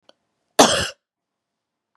{"cough_length": "2.0 s", "cough_amplitude": 32767, "cough_signal_mean_std_ratio": 0.26, "survey_phase": "beta (2021-08-13 to 2022-03-07)", "age": "45-64", "gender": "Female", "wearing_mask": "No", "symptom_cough_any": true, "symptom_new_continuous_cough": true, "symptom_runny_or_blocked_nose": true, "symptom_shortness_of_breath": true, "symptom_fatigue": true, "symptom_headache": true, "symptom_change_to_sense_of_smell_or_taste": true, "symptom_onset": "4 days", "smoker_status": "Never smoked", "respiratory_condition_asthma": false, "respiratory_condition_other": false, "recruitment_source": "Test and Trace", "submission_delay": "1 day", "covid_test_result": "Positive", "covid_test_method": "RT-qPCR", "covid_ct_value": 24.7, "covid_ct_gene": "ORF1ab gene"}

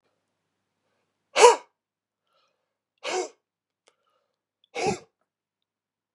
{"exhalation_length": "6.1 s", "exhalation_amplitude": 32577, "exhalation_signal_mean_std_ratio": 0.19, "survey_phase": "beta (2021-08-13 to 2022-03-07)", "age": "65+", "gender": "Male", "wearing_mask": "No", "symptom_runny_or_blocked_nose": true, "symptom_onset": "3 days", "smoker_status": "Never smoked", "respiratory_condition_asthma": false, "respiratory_condition_other": false, "recruitment_source": "Test and Trace", "submission_delay": "2 days", "covid_test_result": "Positive", "covid_test_method": "RT-qPCR", "covid_ct_value": 19.9, "covid_ct_gene": "ORF1ab gene", "covid_ct_mean": 20.4, "covid_viral_load": "210000 copies/ml", "covid_viral_load_category": "Low viral load (10K-1M copies/ml)"}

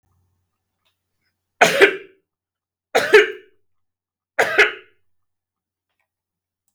{"three_cough_length": "6.7 s", "three_cough_amplitude": 32766, "three_cough_signal_mean_std_ratio": 0.27, "survey_phase": "beta (2021-08-13 to 2022-03-07)", "age": "45-64", "gender": "Male", "wearing_mask": "No", "symptom_shortness_of_breath": true, "symptom_fatigue": true, "symptom_onset": "12 days", "smoker_status": "Never smoked", "respiratory_condition_asthma": false, "respiratory_condition_other": false, "recruitment_source": "REACT", "submission_delay": "1 day", "covid_test_result": "Negative", "covid_test_method": "RT-qPCR", "influenza_a_test_result": "Negative", "influenza_b_test_result": "Negative"}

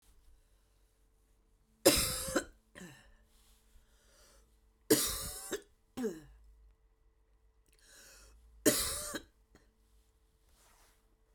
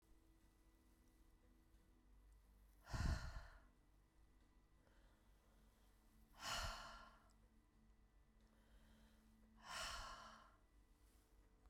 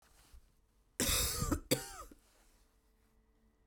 {"three_cough_length": "11.3 s", "three_cough_amplitude": 11105, "three_cough_signal_mean_std_ratio": 0.29, "exhalation_length": "11.7 s", "exhalation_amplitude": 920, "exhalation_signal_mean_std_ratio": 0.41, "cough_length": "3.7 s", "cough_amplitude": 4623, "cough_signal_mean_std_ratio": 0.39, "survey_phase": "beta (2021-08-13 to 2022-03-07)", "age": "45-64", "gender": "Female", "wearing_mask": "No", "symptom_cough_any": true, "symptom_runny_or_blocked_nose": true, "symptom_sore_throat": true, "symptom_onset": "6 days", "smoker_status": "Never smoked", "respiratory_condition_asthma": false, "respiratory_condition_other": false, "recruitment_source": "REACT", "submission_delay": "0 days", "covid_test_result": "Negative", "covid_test_method": "RT-qPCR"}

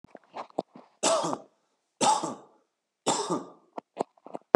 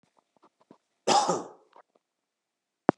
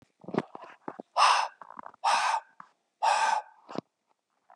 {"three_cough_length": "4.6 s", "three_cough_amplitude": 29772, "three_cough_signal_mean_std_ratio": 0.35, "cough_length": "3.0 s", "cough_amplitude": 23241, "cough_signal_mean_std_ratio": 0.25, "exhalation_length": "4.6 s", "exhalation_amplitude": 11777, "exhalation_signal_mean_std_ratio": 0.44, "survey_phase": "beta (2021-08-13 to 2022-03-07)", "age": "18-44", "gender": "Male", "wearing_mask": "No", "symptom_cough_any": true, "symptom_onset": "11 days", "smoker_status": "Current smoker (1 to 10 cigarettes per day)", "respiratory_condition_asthma": false, "respiratory_condition_other": false, "recruitment_source": "REACT", "submission_delay": "1 day", "covid_test_result": "Negative", "covid_test_method": "RT-qPCR", "influenza_a_test_result": "Negative", "influenza_b_test_result": "Negative"}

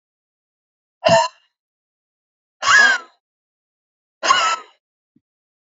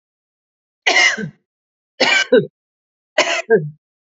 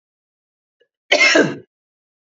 {"exhalation_length": "5.6 s", "exhalation_amplitude": 31175, "exhalation_signal_mean_std_ratio": 0.32, "three_cough_length": "4.2 s", "three_cough_amplitude": 31261, "three_cough_signal_mean_std_ratio": 0.41, "cough_length": "2.3 s", "cough_amplitude": 30464, "cough_signal_mean_std_ratio": 0.34, "survey_phase": "beta (2021-08-13 to 2022-03-07)", "age": "45-64", "gender": "Female", "wearing_mask": "No", "symptom_sore_throat": true, "smoker_status": "Never smoked", "respiratory_condition_asthma": false, "respiratory_condition_other": false, "recruitment_source": "REACT", "submission_delay": "1 day", "covid_test_result": "Negative", "covid_test_method": "RT-qPCR", "influenza_a_test_result": "Negative", "influenza_b_test_result": "Negative"}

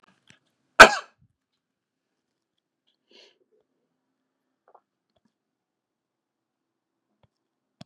{"cough_length": "7.9 s", "cough_amplitude": 32768, "cough_signal_mean_std_ratio": 0.09, "survey_phase": "beta (2021-08-13 to 2022-03-07)", "age": "65+", "gender": "Male", "wearing_mask": "No", "symptom_none": true, "smoker_status": "Ex-smoker", "respiratory_condition_asthma": false, "respiratory_condition_other": false, "recruitment_source": "REACT", "submission_delay": "2 days", "covid_test_result": "Negative", "covid_test_method": "RT-qPCR", "influenza_a_test_result": "Negative", "influenza_b_test_result": "Negative"}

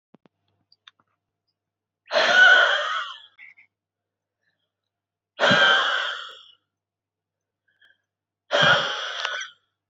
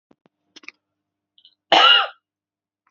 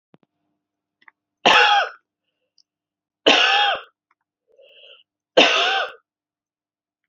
{"exhalation_length": "9.9 s", "exhalation_amplitude": 20847, "exhalation_signal_mean_std_ratio": 0.39, "cough_length": "2.9 s", "cough_amplitude": 28412, "cough_signal_mean_std_ratio": 0.28, "three_cough_length": "7.1 s", "three_cough_amplitude": 30427, "three_cough_signal_mean_std_ratio": 0.36, "survey_phase": "beta (2021-08-13 to 2022-03-07)", "age": "18-44", "gender": "Female", "wearing_mask": "No", "symptom_new_continuous_cough": true, "symptom_shortness_of_breath": true, "symptom_sore_throat": true, "symptom_fatigue": true, "symptom_fever_high_temperature": true, "symptom_onset": "2 days", "smoker_status": "Never smoked", "respiratory_condition_asthma": true, "respiratory_condition_other": false, "recruitment_source": "Test and Trace", "submission_delay": "1 day", "covid_test_result": "Negative", "covid_test_method": "RT-qPCR"}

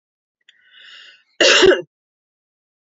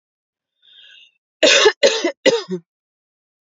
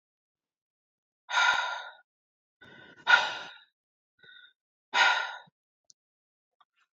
{"cough_length": "2.9 s", "cough_amplitude": 28971, "cough_signal_mean_std_ratio": 0.31, "three_cough_length": "3.6 s", "three_cough_amplitude": 32767, "three_cough_signal_mean_std_ratio": 0.36, "exhalation_length": "7.0 s", "exhalation_amplitude": 13723, "exhalation_signal_mean_std_ratio": 0.31, "survey_phase": "beta (2021-08-13 to 2022-03-07)", "age": "45-64", "gender": "Female", "wearing_mask": "No", "symptom_none": true, "smoker_status": "Ex-smoker", "respiratory_condition_asthma": false, "respiratory_condition_other": false, "recruitment_source": "REACT", "submission_delay": "1 day", "covid_test_result": "Negative", "covid_test_method": "RT-qPCR", "influenza_a_test_result": "Unknown/Void", "influenza_b_test_result": "Unknown/Void"}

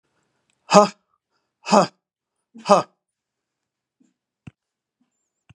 {"exhalation_length": "5.5 s", "exhalation_amplitude": 32768, "exhalation_signal_mean_std_ratio": 0.21, "survey_phase": "beta (2021-08-13 to 2022-03-07)", "age": "65+", "gender": "Male", "wearing_mask": "No", "symptom_none": true, "smoker_status": "Ex-smoker", "respiratory_condition_asthma": false, "respiratory_condition_other": false, "recruitment_source": "REACT", "submission_delay": "2 days", "covid_test_result": "Negative", "covid_test_method": "RT-qPCR", "influenza_a_test_result": "Negative", "influenza_b_test_result": "Negative"}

